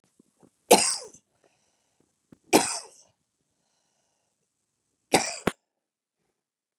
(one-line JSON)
{"three_cough_length": "6.8 s", "three_cough_amplitude": 26926, "three_cough_signal_mean_std_ratio": 0.21, "survey_phase": "beta (2021-08-13 to 2022-03-07)", "age": "45-64", "gender": "Female", "wearing_mask": "No", "symptom_none": true, "smoker_status": "Never smoked", "respiratory_condition_asthma": false, "respiratory_condition_other": false, "recruitment_source": "Test and Trace", "submission_delay": "0 days", "covid_test_result": "Negative", "covid_test_method": "LFT"}